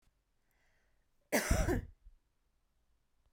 {
  "cough_length": "3.3 s",
  "cough_amplitude": 5061,
  "cough_signal_mean_std_ratio": 0.31,
  "survey_phase": "beta (2021-08-13 to 2022-03-07)",
  "age": "18-44",
  "gender": "Female",
  "wearing_mask": "No",
  "symptom_none": true,
  "smoker_status": "Never smoked",
  "respiratory_condition_asthma": false,
  "respiratory_condition_other": false,
  "recruitment_source": "REACT",
  "submission_delay": "2 days",
  "covid_test_result": "Negative",
  "covid_test_method": "RT-qPCR"
}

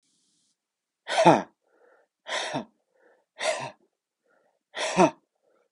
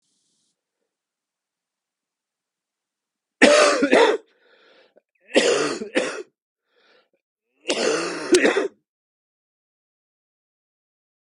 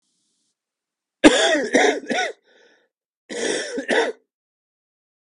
{
  "exhalation_length": "5.7 s",
  "exhalation_amplitude": 24968,
  "exhalation_signal_mean_std_ratio": 0.29,
  "three_cough_length": "11.3 s",
  "three_cough_amplitude": 32768,
  "three_cough_signal_mean_std_ratio": 0.34,
  "cough_length": "5.2 s",
  "cough_amplitude": 32768,
  "cough_signal_mean_std_ratio": 0.4,
  "survey_phase": "beta (2021-08-13 to 2022-03-07)",
  "age": "45-64",
  "gender": "Male",
  "wearing_mask": "No",
  "symptom_cough_any": true,
  "symptom_runny_or_blocked_nose": true,
  "symptom_fever_high_temperature": true,
  "symptom_headache": true,
  "symptom_onset": "3 days",
  "smoker_status": "Never smoked",
  "respiratory_condition_asthma": false,
  "respiratory_condition_other": false,
  "recruitment_source": "Test and Trace",
  "submission_delay": "2 days",
  "covid_test_result": "Positive",
  "covid_test_method": "RT-qPCR",
  "covid_ct_value": 19.8,
  "covid_ct_gene": "ORF1ab gene"
}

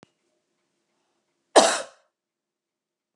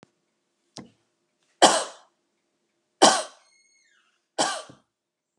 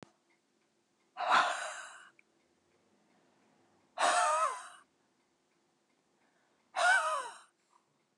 {
  "cough_length": "3.2 s",
  "cough_amplitude": 28557,
  "cough_signal_mean_std_ratio": 0.19,
  "three_cough_length": "5.4 s",
  "three_cough_amplitude": 30725,
  "three_cough_signal_mean_std_ratio": 0.23,
  "exhalation_length": "8.2 s",
  "exhalation_amplitude": 6412,
  "exhalation_signal_mean_std_ratio": 0.37,
  "survey_phase": "beta (2021-08-13 to 2022-03-07)",
  "age": "45-64",
  "gender": "Female",
  "wearing_mask": "No",
  "symptom_none": true,
  "smoker_status": "Never smoked",
  "respiratory_condition_asthma": false,
  "respiratory_condition_other": false,
  "recruitment_source": "REACT",
  "submission_delay": "1 day",
  "covid_test_result": "Negative",
  "covid_test_method": "RT-qPCR"
}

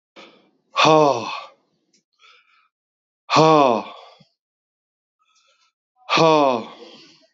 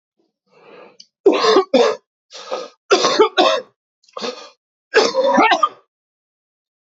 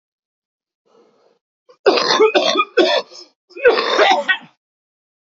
{
  "exhalation_length": "7.3 s",
  "exhalation_amplitude": 27236,
  "exhalation_signal_mean_std_ratio": 0.36,
  "three_cough_length": "6.8 s",
  "three_cough_amplitude": 30372,
  "three_cough_signal_mean_std_ratio": 0.46,
  "cough_length": "5.2 s",
  "cough_amplitude": 29641,
  "cough_signal_mean_std_ratio": 0.47,
  "survey_phase": "beta (2021-08-13 to 2022-03-07)",
  "age": "45-64",
  "gender": "Male",
  "wearing_mask": "No",
  "symptom_cough_any": true,
  "symptom_sore_throat": true,
  "symptom_onset": "2 days",
  "smoker_status": "Ex-smoker",
  "respiratory_condition_asthma": false,
  "respiratory_condition_other": false,
  "recruitment_source": "Test and Trace",
  "submission_delay": "1 day",
  "covid_test_result": "Negative",
  "covid_test_method": "RT-qPCR"
}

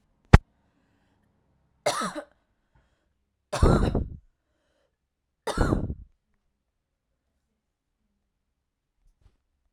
{
  "three_cough_length": "9.7 s",
  "three_cough_amplitude": 32768,
  "three_cough_signal_mean_std_ratio": 0.22,
  "survey_phase": "alpha (2021-03-01 to 2021-08-12)",
  "age": "18-44",
  "gender": "Female",
  "wearing_mask": "No",
  "symptom_fatigue": true,
  "symptom_headache": true,
  "smoker_status": "Never smoked",
  "respiratory_condition_asthma": false,
  "respiratory_condition_other": false,
  "recruitment_source": "REACT",
  "submission_delay": "2 days",
  "covid_test_result": "Negative",
  "covid_test_method": "RT-qPCR"
}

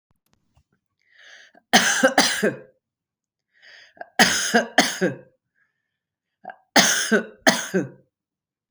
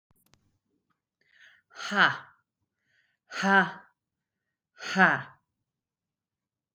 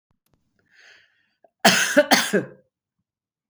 {
  "three_cough_length": "8.7 s",
  "three_cough_amplitude": 32768,
  "three_cough_signal_mean_std_ratio": 0.38,
  "exhalation_length": "6.7 s",
  "exhalation_amplitude": 14782,
  "exhalation_signal_mean_std_ratio": 0.27,
  "cough_length": "3.5 s",
  "cough_amplitude": 32768,
  "cough_signal_mean_std_ratio": 0.32,
  "survey_phase": "beta (2021-08-13 to 2022-03-07)",
  "age": "45-64",
  "gender": "Female",
  "wearing_mask": "No",
  "symptom_none": true,
  "smoker_status": "Never smoked",
  "respiratory_condition_asthma": false,
  "respiratory_condition_other": false,
  "recruitment_source": "Test and Trace",
  "submission_delay": "1 day",
  "covid_test_result": "Negative",
  "covid_test_method": "RT-qPCR"
}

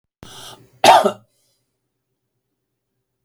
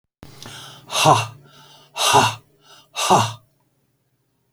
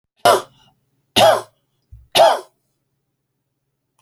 {
  "cough_length": "3.2 s",
  "cough_amplitude": 32767,
  "cough_signal_mean_std_ratio": 0.23,
  "exhalation_length": "4.5 s",
  "exhalation_amplitude": 32768,
  "exhalation_signal_mean_std_ratio": 0.39,
  "three_cough_length": "4.0 s",
  "three_cough_amplitude": 31529,
  "three_cough_signal_mean_std_ratio": 0.32,
  "survey_phase": "alpha (2021-03-01 to 2021-08-12)",
  "age": "65+",
  "gender": "Male",
  "wearing_mask": "No",
  "symptom_none": true,
  "symptom_onset": "7 days",
  "smoker_status": "Never smoked",
  "respiratory_condition_asthma": false,
  "respiratory_condition_other": false,
  "recruitment_source": "REACT",
  "submission_delay": "1 day",
  "covid_test_result": "Negative",
  "covid_test_method": "RT-qPCR"
}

